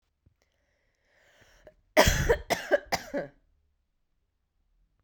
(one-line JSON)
{"cough_length": "5.0 s", "cough_amplitude": 25718, "cough_signal_mean_std_ratio": 0.29, "survey_phase": "beta (2021-08-13 to 2022-03-07)", "age": "45-64", "gender": "Female", "wearing_mask": "No", "symptom_fatigue": true, "symptom_headache": true, "smoker_status": "Never smoked", "respiratory_condition_asthma": false, "respiratory_condition_other": false, "recruitment_source": "Test and Trace", "submission_delay": "1 day", "covid_test_result": "Positive", "covid_test_method": "RT-qPCR"}